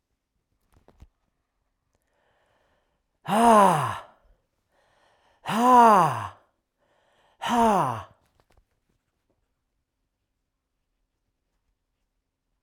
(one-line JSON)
{"exhalation_length": "12.6 s", "exhalation_amplitude": 18740, "exhalation_signal_mean_std_ratio": 0.3, "survey_phase": "alpha (2021-03-01 to 2021-08-12)", "age": "65+", "gender": "Male", "wearing_mask": "No", "symptom_none": true, "smoker_status": "Never smoked", "respiratory_condition_asthma": false, "respiratory_condition_other": false, "recruitment_source": "REACT", "submission_delay": "1 day", "covid_test_result": "Negative", "covid_test_method": "RT-qPCR"}